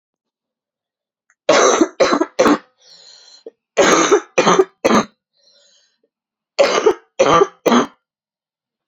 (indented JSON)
{
  "three_cough_length": "8.9 s",
  "three_cough_amplitude": 32767,
  "three_cough_signal_mean_std_ratio": 0.44,
  "survey_phase": "beta (2021-08-13 to 2022-03-07)",
  "age": "18-44",
  "gender": "Female",
  "wearing_mask": "No",
  "symptom_cough_any": true,
  "symptom_runny_or_blocked_nose": true,
  "symptom_shortness_of_breath": true,
  "symptom_headache": true,
  "symptom_onset": "2 days",
  "smoker_status": "Ex-smoker",
  "respiratory_condition_asthma": false,
  "respiratory_condition_other": false,
  "recruitment_source": "Test and Trace",
  "submission_delay": "0 days",
  "covid_test_result": "Positive",
  "covid_test_method": "LAMP"
}